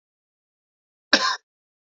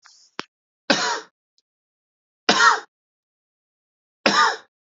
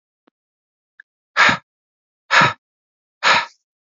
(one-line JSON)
{"cough_length": "2.0 s", "cough_amplitude": 32767, "cough_signal_mean_std_ratio": 0.23, "three_cough_length": "4.9 s", "three_cough_amplitude": 32767, "three_cough_signal_mean_std_ratio": 0.32, "exhalation_length": "3.9 s", "exhalation_amplitude": 29920, "exhalation_signal_mean_std_ratio": 0.31, "survey_phase": "beta (2021-08-13 to 2022-03-07)", "age": "45-64", "gender": "Male", "wearing_mask": "No", "symptom_shortness_of_breath": true, "symptom_fatigue": true, "symptom_onset": "12 days", "smoker_status": "Ex-smoker", "respiratory_condition_asthma": true, "respiratory_condition_other": false, "recruitment_source": "REACT", "submission_delay": "3 days", "covid_test_result": "Negative", "covid_test_method": "RT-qPCR", "influenza_a_test_result": "Negative", "influenza_b_test_result": "Negative"}